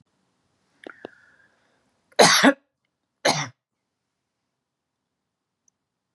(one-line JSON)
{"cough_length": "6.1 s", "cough_amplitude": 28628, "cough_signal_mean_std_ratio": 0.22, "survey_phase": "beta (2021-08-13 to 2022-03-07)", "age": "65+", "gender": "Female", "wearing_mask": "No", "symptom_none": true, "smoker_status": "Never smoked", "respiratory_condition_asthma": false, "respiratory_condition_other": false, "recruitment_source": "REACT", "submission_delay": "2 days", "covid_test_result": "Negative", "covid_test_method": "RT-qPCR", "influenza_a_test_result": "Negative", "influenza_b_test_result": "Negative"}